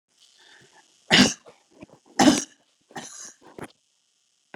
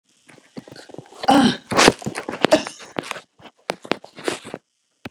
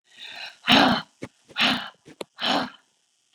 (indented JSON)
{
  "three_cough_length": "4.6 s",
  "three_cough_amplitude": 27568,
  "three_cough_signal_mean_std_ratio": 0.26,
  "cough_length": "5.1 s",
  "cough_amplitude": 32768,
  "cough_signal_mean_std_ratio": 0.34,
  "exhalation_length": "3.3 s",
  "exhalation_amplitude": 24354,
  "exhalation_signal_mean_std_ratio": 0.41,
  "survey_phase": "beta (2021-08-13 to 2022-03-07)",
  "age": "65+",
  "gender": "Female",
  "wearing_mask": "No",
  "symptom_shortness_of_breath": true,
  "smoker_status": "Ex-smoker",
  "respiratory_condition_asthma": false,
  "respiratory_condition_other": false,
  "recruitment_source": "REACT",
  "submission_delay": "3 days",
  "covid_test_result": "Negative",
  "covid_test_method": "RT-qPCR",
  "influenza_a_test_result": "Unknown/Void",
  "influenza_b_test_result": "Unknown/Void"
}